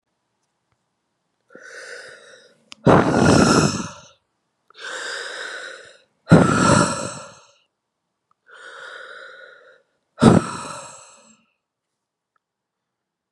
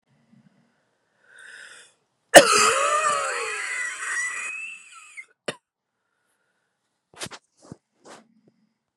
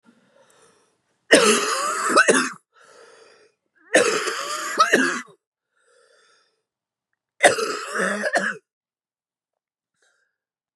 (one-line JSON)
{"exhalation_length": "13.3 s", "exhalation_amplitude": 32768, "exhalation_signal_mean_std_ratio": 0.34, "cough_length": "9.0 s", "cough_amplitude": 32768, "cough_signal_mean_std_ratio": 0.3, "three_cough_length": "10.8 s", "three_cough_amplitude": 32760, "three_cough_signal_mean_std_ratio": 0.4, "survey_phase": "beta (2021-08-13 to 2022-03-07)", "age": "45-64", "gender": "Female", "wearing_mask": "No", "symptom_cough_any": true, "symptom_new_continuous_cough": true, "symptom_runny_or_blocked_nose": true, "symptom_shortness_of_breath": true, "symptom_sore_throat": true, "symptom_fatigue": true, "symptom_fever_high_temperature": true, "symptom_headache": true, "symptom_change_to_sense_of_smell_or_taste": true, "symptom_loss_of_taste": true, "smoker_status": "Never smoked", "respiratory_condition_asthma": false, "respiratory_condition_other": false, "recruitment_source": "Test and Trace", "submission_delay": "1 day", "covid_test_result": "Positive", "covid_test_method": "LFT"}